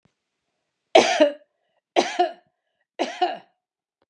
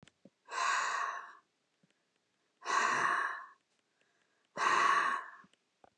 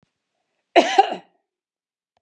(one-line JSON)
{"three_cough_length": "4.1 s", "three_cough_amplitude": 32280, "three_cough_signal_mean_std_ratio": 0.32, "exhalation_length": "6.0 s", "exhalation_amplitude": 4608, "exhalation_signal_mean_std_ratio": 0.51, "cough_length": "2.2 s", "cough_amplitude": 29340, "cough_signal_mean_std_ratio": 0.26, "survey_phase": "beta (2021-08-13 to 2022-03-07)", "age": "65+", "gender": "Female", "wearing_mask": "No", "symptom_none": true, "symptom_onset": "12 days", "smoker_status": "Ex-smoker", "respiratory_condition_asthma": false, "respiratory_condition_other": false, "recruitment_source": "REACT", "submission_delay": "1 day", "covid_test_result": "Negative", "covid_test_method": "RT-qPCR", "influenza_a_test_result": "Negative", "influenza_b_test_result": "Negative"}